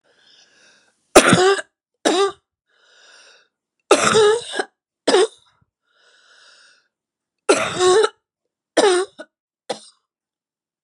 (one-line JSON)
{"three_cough_length": "10.8 s", "three_cough_amplitude": 32768, "three_cough_signal_mean_std_ratio": 0.36, "survey_phase": "beta (2021-08-13 to 2022-03-07)", "age": "45-64", "gender": "Female", "wearing_mask": "No", "symptom_new_continuous_cough": true, "symptom_runny_or_blocked_nose": true, "symptom_shortness_of_breath": true, "symptom_sore_throat": true, "symptom_fatigue": true, "symptom_headache": true, "symptom_other": true, "smoker_status": "Never smoked", "respiratory_condition_asthma": true, "respiratory_condition_other": false, "recruitment_source": "Test and Trace", "submission_delay": "2 days", "covid_test_result": "Positive", "covid_test_method": "LFT"}